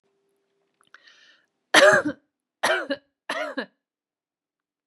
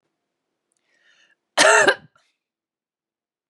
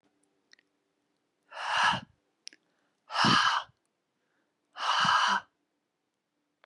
{"three_cough_length": "4.9 s", "three_cough_amplitude": 28988, "three_cough_signal_mean_std_ratio": 0.29, "cough_length": "3.5 s", "cough_amplitude": 32767, "cough_signal_mean_std_ratio": 0.26, "exhalation_length": "6.7 s", "exhalation_amplitude": 9646, "exhalation_signal_mean_std_ratio": 0.39, "survey_phase": "beta (2021-08-13 to 2022-03-07)", "age": "18-44", "gender": "Female", "wearing_mask": "No", "symptom_cough_any": true, "symptom_sore_throat": true, "symptom_headache": true, "symptom_onset": "10 days", "smoker_status": "Ex-smoker", "respiratory_condition_asthma": false, "respiratory_condition_other": false, "recruitment_source": "REACT", "submission_delay": "2 days", "covid_test_result": "Negative", "covid_test_method": "RT-qPCR", "influenza_a_test_result": "Negative", "influenza_b_test_result": "Negative"}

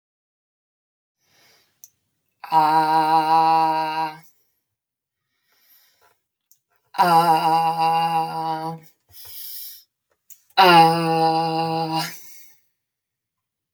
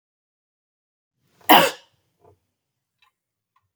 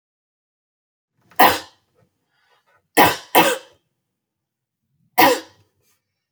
{"exhalation_length": "13.7 s", "exhalation_amplitude": 28365, "exhalation_signal_mean_std_ratio": 0.49, "cough_length": "3.8 s", "cough_amplitude": 32768, "cough_signal_mean_std_ratio": 0.18, "three_cough_length": "6.3 s", "three_cough_amplitude": 32768, "three_cough_signal_mean_std_ratio": 0.27, "survey_phase": "beta (2021-08-13 to 2022-03-07)", "age": "18-44", "gender": "Female", "wearing_mask": "No", "symptom_fatigue": true, "smoker_status": "Ex-smoker", "respiratory_condition_asthma": false, "respiratory_condition_other": false, "recruitment_source": "REACT", "submission_delay": "3 days", "covid_test_result": "Negative", "covid_test_method": "RT-qPCR", "influenza_a_test_result": "Negative", "influenza_b_test_result": "Negative"}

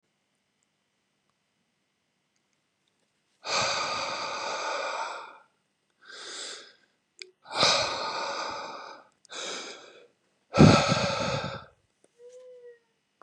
{"exhalation_length": "13.2 s", "exhalation_amplitude": 20579, "exhalation_signal_mean_std_ratio": 0.38, "survey_phase": "beta (2021-08-13 to 2022-03-07)", "age": "45-64", "gender": "Male", "wearing_mask": "No", "symptom_none": true, "smoker_status": "Ex-smoker", "respiratory_condition_asthma": false, "respiratory_condition_other": false, "recruitment_source": "REACT", "submission_delay": "2 days", "covid_test_result": "Negative", "covid_test_method": "RT-qPCR", "influenza_a_test_result": "Negative", "influenza_b_test_result": "Negative"}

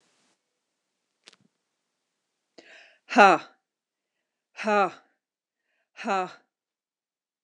{"exhalation_length": "7.4 s", "exhalation_amplitude": 26010, "exhalation_signal_mean_std_ratio": 0.21, "survey_phase": "beta (2021-08-13 to 2022-03-07)", "age": "45-64", "gender": "Female", "wearing_mask": "No", "symptom_none": true, "smoker_status": "Ex-smoker", "respiratory_condition_asthma": false, "respiratory_condition_other": false, "recruitment_source": "REACT", "submission_delay": "0 days", "covid_test_result": "Negative", "covid_test_method": "RT-qPCR"}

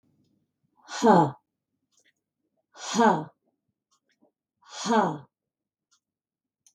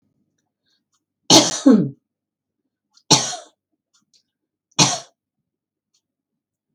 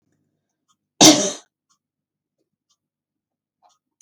{"exhalation_length": "6.7 s", "exhalation_amplitude": 17379, "exhalation_signal_mean_std_ratio": 0.3, "three_cough_length": "6.7 s", "three_cough_amplitude": 32768, "three_cough_signal_mean_std_ratio": 0.26, "cough_length": "4.0 s", "cough_amplitude": 32768, "cough_signal_mean_std_ratio": 0.19, "survey_phase": "beta (2021-08-13 to 2022-03-07)", "age": "45-64", "gender": "Female", "wearing_mask": "No", "symptom_none": true, "smoker_status": "Never smoked", "respiratory_condition_asthma": false, "respiratory_condition_other": false, "recruitment_source": "REACT", "submission_delay": "1 day", "covid_test_result": "Negative", "covid_test_method": "RT-qPCR", "influenza_a_test_result": "Negative", "influenza_b_test_result": "Negative"}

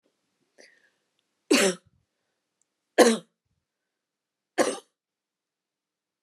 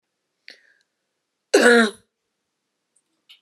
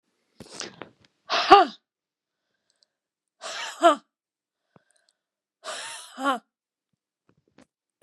{"three_cough_length": "6.2 s", "three_cough_amplitude": 26662, "three_cough_signal_mean_std_ratio": 0.22, "cough_length": "3.4 s", "cough_amplitude": 27398, "cough_signal_mean_std_ratio": 0.26, "exhalation_length": "8.0 s", "exhalation_amplitude": 29204, "exhalation_signal_mean_std_ratio": 0.22, "survey_phase": "beta (2021-08-13 to 2022-03-07)", "age": "45-64", "gender": "Female", "wearing_mask": "No", "symptom_none": true, "smoker_status": "Never smoked", "respiratory_condition_asthma": false, "respiratory_condition_other": false, "recruitment_source": "REACT", "submission_delay": "1 day", "covid_test_result": "Negative", "covid_test_method": "RT-qPCR"}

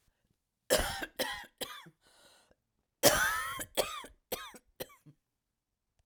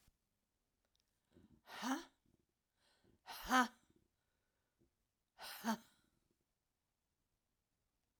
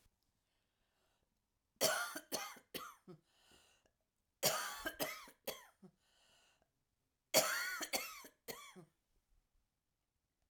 {"cough_length": "6.1 s", "cough_amplitude": 12370, "cough_signal_mean_std_ratio": 0.35, "exhalation_length": "8.2 s", "exhalation_amplitude": 2714, "exhalation_signal_mean_std_ratio": 0.22, "three_cough_length": "10.5 s", "three_cough_amplitude": 4561, "three_cough_signal_mean_std_ratio": 0.33, "survey_phase": "alpha (2021-03-01 to 2021-08-12)", "age": "65+", "gender": "Female", "wearing_mask": "No", "symptom_cough_any": true, "symptom_fatigue": true, "symptom_headache": true, "smoker_status": "Ex-smoker", "respiratory_condition_asthma": false, "respiratory_condition_other": false, "recruitment_source": "Test and Trace", "submission_delay": "2 days", "covid_test_result": "Positive", "covid_test_method": "RT-qPCR"}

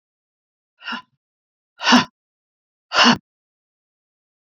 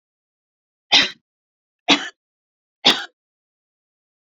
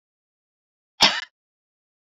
{"exhalation_length": "4.4 s", "exhalation_amplitude": 28847, "exhalation_signal_mean_std_ratio": 0.26, "three_cough_length": "4.3 s", "three_cough_amplitude": 29862, "three_cough_signal_mean_std_ratio": 0.24, "cough_length": "2.0 s", "cough_amplitude": 30595, "cough_signal_mean_std_ratio": 0.2, "survey_phase": "beta (2021-08-13 to 2022-03-07)", "age": "65+", "gender": "Female", "wearing_mask": "No", "symptom_none": true, "symptom_onset": "5 days", "smoker_status": "Never smoked", "respiratory_condition_asthma": false, "respiratory_condition_other": false, "recruitment_source": "REACT", "submission_delay": "1 day", "covid_test_result": "Negative", "covid_test_method": "RT-qPCR"}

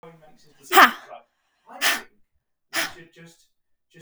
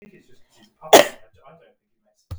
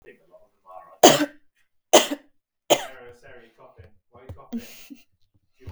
{"exhalation_length": "4.0 s", "exhalation_amplitude": 32766, "exhalation_signal_mean_std_ratio": 0.25, "cough_length": "2.4 s", "cough_amplitude": 32768, "cough_signal_mean_std_ratio": 0.2, "three_cough_length": "5.7 s", "three_cough_amplitude": 32768, "three_cough_signal_mean_std_ratio": 0.24, "survey_phase": "beta (2021-08-13 to 2022-03-07)", "age": "18-44", "gender": "Female", "wearing_mask": "No", "symptom_none": true, "smoker_status": "Never smoked", "respiratory_condition_asthma": false, "respiratory_condition_other": false, "recruitment_source": "REACT", "submission_delay": "1 day", "covid_test_result": "Negative", "covid_test_method": "RT-qPCR", "influenza_a_test_result": "Unknown/Void", "influenza_b_test_result": "Unknown/Void"}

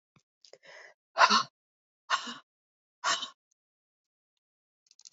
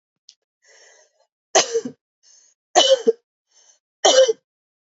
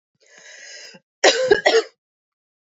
{"exhalation_length": "5.1 s", "exhalation_amplitude": 14534, "exhalation_signal_mean_std_ratio": 0.24, "three_cough_length": "4.9 s", "three_cough_amplitude": 30341, "three_cough_signal_mean_std_ratio": 0.32, "cough_length": "2.6 s", "cough_amplitude": 31663, "cough_signal_mean_std_ratio": 0.36, "survey_phase": "beta (2021-08-13 to 2022-03-07)", "age": "18-44", "gender": "Female", "wearing_mask": "No", "symptom_cough_any": true, "symptom_runny_or_blocked_nose": true, "symptom_shortness_of_breath": true, "symptom_sore_throat": true, "symptom_fever_high_temperature": true, "symptom_headache": true, "symptom_loss_of_taste": true, "symptom_onset": "2 days", "smoker_status": "Never smoked", "respiratory_condition_asthma": false, "respiratory_condition_other": false, "recruitment_source": "Test and Trace", "submission_delay": "2 days", "covid_test_result": "Positive", "covid_test_method": "RT-qPCR", "covid_ct_value": 16.8, "covid_ct_gene": "ORF1ab gene", "covid_ct_mean": 17.5, "covid_viral_load": "1900000 copies/ml", "covid_viral_load_category": "High viral load (>1M copies/ml)"}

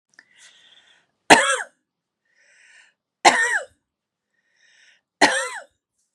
{"three_cough_length": "6.1 s", "three_cough_amplitude": 32768, "three_cough_signal_mean_std_ratio": 0.27, "survey_phase": "beta (2021-08-13 to 2022-03-07)", "age": "45-64", "gender": "Female", "wearing_mask": "No", "symptom_none": true, "smoker_status": "Ex-smoker", "respiratory_condition_asthma": true, "respiratory_condition_other": false, "recruitment_source": "REACT", "submission_delay": "1 day", "covid_test_result": "Negative", "covid_test_method": "RT-qPCR", "influenza_a_test_result": "Unknown/Void", "influenza_b_test_result": "Unknown/Void"}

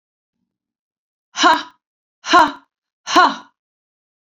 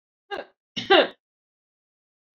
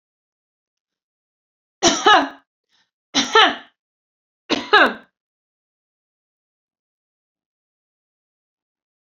{"exhalation_length": "4.4 s", "exhalation_amplitude": 29895, "exhalation_signal_mean_std_ratio": 0.31, "cough_length": "2.4 s", "cough_amplitude": 19769, "cough_signal_mean_std_ratio": 0.25, "three_cough_length": "9.0 s", "three_cough_amplitude": 32382, "three_cough_signal_mean_std_ratio": 0.25, "survey_phase": "beta (2021-08-13 to 2022-03-07)", "age": "65+", "gender": "Female", "wearing_mask": "No", "symptom_cough_any": true, "symptom_runny_or_blocked_nose": true, "symptom_shortness_of_breath": true, "symptom_fatigue": true, "symptom_onset": "4 days", "smoker_status": "Never smoked", "respiratory_condition_asthma": false, "respiratory_condition_other": false, "recruitment_source": "Test and Trace", "submission_delay": "2 days", "covid_test_result": "Positive", "covid_test_method": "RT-qPCR", "covid_ct_value": 21.0, "covid_ct_gene": "ORF1ab gene", "covid_ct_mean": 21.4, "covid_viral_load": "97000 copies/ml", "covid_viral_load_category": "Low viral load (10K-1M copies/ml)"}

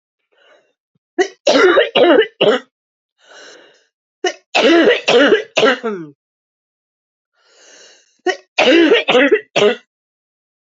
{"three_cough_length": "10.7 s", "three_cough_amplitude": 32768, "three_cough_signal_mean_std_ratio": 0.47, "survey_phase": "beta (2021-08-13 to 2022-03-07)", "age": "18-44", "gender": "Female", "wearing_mask": "No", "symptom_cough_any": true, "symptom_shortness_of_breath": true, "symptom_headache": true, "symptom_change_to_sense_of_smell_or_taste": true, "smoker_status": "Never smoked", "respiratory_condition_asthma": true, "respiratory_condition_other": false, "recruitment_source": "Test and Trace", "submission_delay": "0 days", "covid_test_result": "Positive", "covid_test_method": "RT-qPCR", "covid_ct_value": 15.9, "covid_ct_gene": "S gene", "covid_ct_mean": 16.0, "covid_viral_load": "5500000 copies/ml", "covid_viral_load_category": "High viral load (>1M copies/ml)"}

